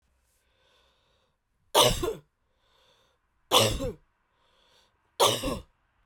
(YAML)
three_cough_length: 6.1 s
three_cough_amplitude: 17648
three_cough_signal_mean_std_ratio: 0.32
survey_phase: beta (2021-08-13 to 2022-03-07)
age: 45-64
gender: Female
wearing_mask: 'No'
symptom_cough_any: true
symptom_runny_or_blocked_nose: true
symptom_shortness_of_breath: true
symptom_fatigue: true
symptom_loss_of_taste: true
symptom_onset: 4 days
smoker_status: Ex-smoker
respiratory_condition_asthma: false
respiratory_condition_other: false
recruitment_source: Test and Trace
submission_delay: 2 days
covid_test_result: Positive
covid_test_method: RT-qPCR
covid_ct_value: 22.2
covid_ct_gene: ORF1ab gene